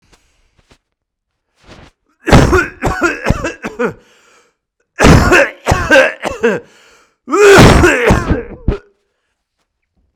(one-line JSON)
{"cough_length": "10.2 s", "cough_amplitude": 32768, "cough_signal_mean_std_ratio": 0.47, "survey_phase": "beta (2021-08-13 to 2022-03-07)", "age": "18-44", "gender": "Male", "wearing_mask": "No", "symptom_fatigue": true, "symptom_other": true, "smoker_status": "Never smoked", "respiratory_condition_asthma": false, "respiratory_condition_other": false, "recruitment_source": "REACT", "submission_delay": "2 days", "covid_test_result": "Negative", "covid_test_method": "RT-qPCR", "influenza_a_test_result": "Negative", "influenza_b_test_result": "Negative"}